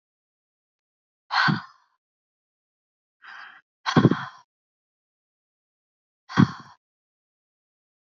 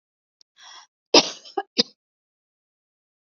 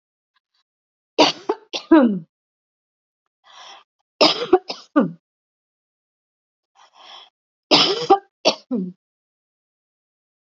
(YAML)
exhalation_length: 8.0 s
exhalation_amplitude: 27186
exhalation_signal_mean_std_ratio: 0.22
cough_length: 3.3 s
cough_amplitude: 29118
cough_signal_mean_std_ratio: 0.18
three_cough_length: 10.4 s
three_cough_amplitude: 32768
three_cough_signal_mean_std_ratio: 0.29
survey_phase: beta (2021-08-13 to 2022-03-07)
age: 65+
gender: Female
wearing_mask: 'No'
symptom_none: true
smoker_status: Never smoked
respiratory_condition_asthma: false
respiratory_condition_other: false
recruitment_source: REACT
submission_delay: 1 day
covid_test_result: Negative
covid_test_method: RT-qPCR
influenza_a_test_result: Negative
influenza_b_test_result: Negative